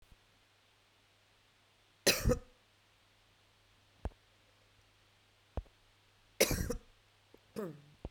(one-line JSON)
{"cough_length": "8.1 s", "cough_amplitude": 7043, "cough_signal_mean_std_ratio": 0.26, "survey_phase": "beta (2021-08-13 to 2022-03-07)", "age": "45-64", "gender": "Female", "wearing_mask": "No", "symptom_runny_or_blocked_nose": true, "symptom_sore_throat": true, "symptom_fever_high_temperature": true, "symptom_headache": true, "symptom_change_to_sense_of_smell_or_taste": true, "symptom_loss_of_taste": true, "symptom_onset": "3 days", "smoker_status": "Ex-smoker", "respiratory_condition_asthma": false, "respiratory_condition_other": false, "recruitment_source": "Test and Trace", "submission_delay": "2 days", "covid_test_result": "Positive", "covid_test_method": "RT-qPCR", "covid_ct_value": 15.5, "covid_ct_gene": "ORF1ab gene", "covid_ct_mean": 16.0, "covid_viral_load": "5600000 copies/ml", "covid_viral_load_category": "High viral load (>1M copies/ml)"}